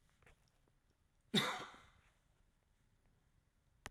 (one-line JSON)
{"cough_length": "3.9 s", "cough_amplitude": 3127, "cough_signal_mean_std_ratio": 0.24, "survey_phase": "alpha (2021-03-01 to 2021-08-12)", "age": "65+", "gender": "Male", "wearing_mask": "No", "symptom_none": true, "smoker_status": "Ex-smoker", "respiratory_condition_asthma": false, "respiratory_condition_other": false, "recruitment_source": "REACT", "submission_delay": "2 days", "covid_test_result": "Negative", "covid_test_method": "RT-qPCR"}